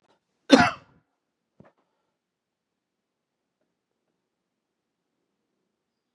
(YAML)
cough_length: 6.1 s
cough_amplitude: 31257
cough_signal_mean_std_ratio: 0.13
survey_phase: beta (2021-08-13 to 2022-03-07)
age: 65+
gender: Male
wearing_mask: 'No'
symptom_diarrhoea: true
smoker_status: Ex-smoker
respiratory_condition_asthma: false
respiratory_condition_other: false
recruitment_source: REACT
submission_delay: 1 day
covid_test_result: Negative
covid_test_method: RT-qPCR
influenza_a_test_result: Negative
influenza_b_test_result: Negative